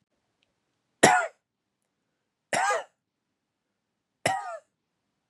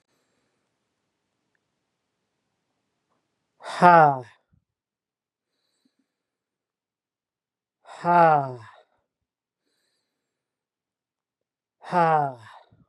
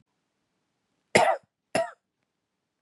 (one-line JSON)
{"three_cough_length": "5.3 s", "three_cough_amplitude": 29203, "three_cough_signal_mean_std_ratio": 0.27, "exhalation_length": "12.9 s", "exhalation_amplitude": 30550, "exhalation_signal_mean_std_ratio": 0.22, "cough_length": "2.8 s", "cough_amplitude": 23179, "cough_signal_mean_std_ratio": 0.26, "survey_phase": "beta (2021-08-13 to 2022-03-07)", "age": "18-44", "gender": "Male", "wearing_mask": "No", "symptom_none": true, "smoker_status": "Never smoked", "respiratory_condition_asthma": false, "respiratory_condition_other": false, "recruitment_source": "REACT", "submission_delay": "1 day", "covid_test_result": "Negative", "covid_test_method": "RT-qPCR", "influenza_a_test_result": "Negative", "influenza_b_test_result": "Negative"}